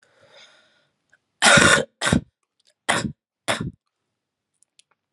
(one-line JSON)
{"three_cough_length": "5.1 s", "three_cough_amplitude": 32767, "three_cough_signal_mean_std_ratio": 0.31, "survey_phase": "alpha (2021-03-01 to 2021-08-12)", "age": "18-44", "gender": "Female", "wearing_mask": "No", "symptom_cough_any": true, "symptom_fatigue": true, "symptom_fever_high_temperature": true, "smoker_status": "Never smoked", "respiratory_condition_asthma": false, "respiratory_condition_other": false, "recruitment_source": "Test and Trace", "submission_delay": "0 days", "covid_test_result": "Positive", "covid_test_method": "LFT"}